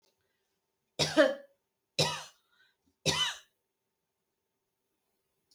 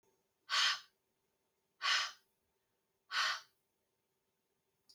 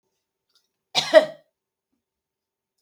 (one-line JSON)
{"three_cough_length": "5.5 s", "three_cough_amplitude": 10029, "three_cough_signal_mean_std_ratio": 0.27, "exhalation_length": "4.9 s", "exhalation_amplitude": 3041, "exhalation_signal_mean_std_ratio": 0.33, "cough_length": "2.8 s", "cough_amplitude": 32079, "cough_signal_mean_std_ratio": 0.19, "survey_phase": "beta (2021-08-13 to 2022-03-07)", "age": "45-64", "gender": "Female", "wearing_mask": "No", "symptom_none": true, "smoker_status": "Never smoked", "respiratory_condition_asthma": false, "respiratory_condition_other": false, "recruitment_source": "REACT", "submission_delay": "2 days", "covid_test_result": "Negative", "covid_test_method": "RT-qPCR"}